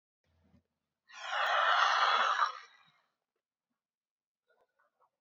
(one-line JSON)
{"exhalation_length": "5.2 s", "exhalation_amplitude": 6697, "exhalation_signal_mean_std_ratio": 0.42, "survey_phase": "beta (2021-08-13 to 2022-03-07)", "age": "18-44", "gender": "Female", "wearing_mask": "No", "symptom_cough_any": true, "symptom_runny_or_blocked_nose": true, "symptom_sore_throat": true, "symptom_fatigue": true, "symptom_fever_high_temperature": true, "symptom_headache": true, "symptom_change_to_sense_of_smell_or_taste": true, "symptom_loss_of_taste": true, "symptom_onset": "4 days", "smoker_status": "Never smoked", "respiratory_condition_asthma": true, "respiratory_condition_other": false, "recruitment_source": "Test and Trace", "submission_delay": "1 day", "covid_test_result": "Positive", "covid_test_method": "RT-qPCR", "covid_ct_value": 15.2, "covid_ct_gene": "N gene", "covid_ct_mean": 15.9, "covid_viral_load": "6300000 copies/ml", "covid_viral_load_category": "High viral load (>1M copies/ml)"}